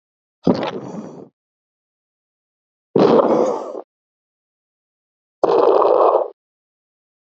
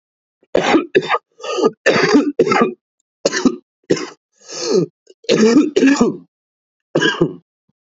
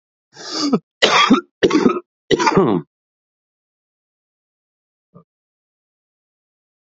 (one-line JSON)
{"exhalation_length": "7.3 s", "exhalation_amplitude": 27329, "exhalation_signal_mean_std_ratio": 0.41, "three_cough_length": "7.9 s", "three_cough_amplitude": 32768, "three_cough_signal_mean_std_ratio": 0.53, "cough_length": "7.0 s", "cough_amplitude": 31180, "cough_signal_mean_std_ratio": 0.35, "survey_phase": "beta (2021-08-13 to 2022-03-07)", "age": "18-44", "gender": "Male", "wearing_mask": "No", "symptom_cough_any": true, "symptom_runny_or_blocked_nose": true, "symptom_fatigue": true, "symptom_fever_high_temperature": true, "symptom_change_to_sense_of_smell_or_taste": true, "symptom_loss_of_taste": true, "symptom_onset": "4 days", "smoker_status": "Current smoker (1 to 10 cigarettes per day)", "respiratory_condition_asthma": false, "respiratory_condition_other": false, "recruitment_source": "Test and Trace", "submission_delay": "2 days", "covid_test_result": "Positive", "covid_test_method": "RT-qPCR", "covid_ct_value": 12.6, "covid_ct_gene": "ORF1ab gene", "covid_ct_mean": 13.0, "covid_viral_load": "56000000 copies/ml", "covid_viral_load_category": "High viral load (>1M copies/ml)"}